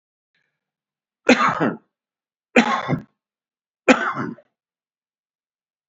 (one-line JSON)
{"three_cough_length": "5.9 s", "three_cough_amplitude": 29267, "three_cough_signal_mean_std_ratio": 0.31, "survey_phase": "beta (2021-08-13 to 2022-03-07)", "age": "45-64", "gender": "Male", "wearing_mask": "No", "symptom_cough_any": true, "symptom_runny_or_blocked_nose": true, "symptom_headache": true, "smoker_status": "Ex-smoker", "respiratory_condition_asthma": false, "respiratory_condition_other": true, "recruitment_source": "Test and Trace", "submission_delay": "1 day", "covid_test_result": "Positive", "covid_test_method": "RT-qPCR", "covid_ct_value": 16.8, "covid_ct_gene": "ORF1ab gene", "covid_ct_mean": 17.4, "covid_viral_load": "1900000 copies/ml", "covid_viral_load_category": "High viral load (>1M copies/ml)"}